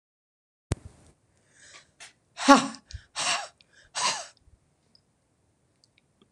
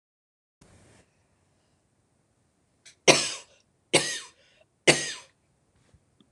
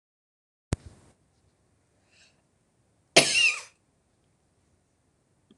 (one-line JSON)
{"exhalation_length": "6.3 s", "exhalation_amplitude": 26027, "exhalation_signal_mean_std_ratio": 0.23, "three_cough_length": "6.3 s", "three_cough_amplitude": 25886, "three_cough_signal_mean_std_ratio": 0.22, "cough_length": "5.6 s", "cough_amplitude": 25228, "cough_signal_mean_std_ratio": 0.21, "survey_phase": "beta (2021-08-13 to 2022-03-07)", "age": "65+", "gender": "Female", "wearing_mask": "No", "symptom_other": true, "symptom_onset": "11 days", "smoker_status": "Never smoked", "respiratory_condition_asthma": true, "respiratory_condition_other": false, "recruitment_source": "REACT", "submission_delay": "2 days", "covid_test_result": "Negative", "covid_test_method": "RT-qPCR"}